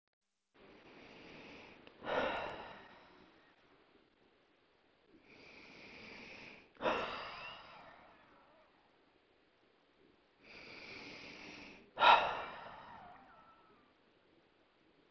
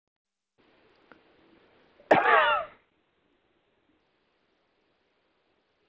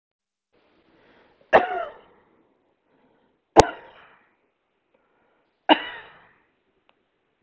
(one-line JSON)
{"exhalation_length": "15.1 s", "exhalation_amplitude": 7046, "exhalation_signal_mean_std_ratio": 0.29, "cough_length": "5.9 s", "cough_amplitude": 19527, "cough_signal_mean_std_ratio": 0.24, "three_cough_length": "7.4 s", "three_cough_amplitude": 32768, "three_cough_signal_mean_std_ratio": 0.18, "survey_phase": "beta (2021-08-13 to 2022-03-07)", "age": "18-44", "gender": "Female", "wearing_mask": "No", "symptom_cough_any": true, "smoker_status": "Never smoked", "respiratory_condition_asthma": true, "respiratory_condition_other": false, "recruitment_source": "REACT", "submission_delay": "2 days", "covid_test_result": "Negative", "covid_test_method": "RT-qPCR", "influenza_a_test_result": "Negative", "influenza_b_test_result": "Negative"}